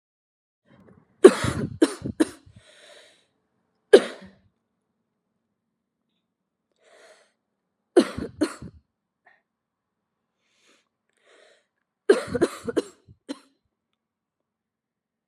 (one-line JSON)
{"three_cough_length": "15.3 s", "three_cough_amplitude": 32768, "three_cough_signal_mean_std_ratio": 0.18, "survey_phase": "alpha (2021-03-01 to 2021-08-12)", "age": "18-44", "gender": "Female", "wearing_mask": "No", "symptom_cough_any": true, "symptom_fatigue": true, "symptom_fever_high_temperature": true, "symptom_onset": "3 days", "smoker_status": "Current smoker (1 to 10 cigarettes per day)", "respiratory_condition_asthma": false, "respiratory_condition_other": false, "recruitment_source": "Test and Trace", "submission_delay": "2 days", "covid_test_result": "Positive", "covid_test_method": "RT-qPCR", "covid_ct_value": 17.4, "covid_ct_gene": "ORF1ab gene", "covid_ct_mean": 18.4, "covid_viral_load": "920000 copies/ml", "covid_viral_load_category": "Low viral load (10K-1M copies/ml)"}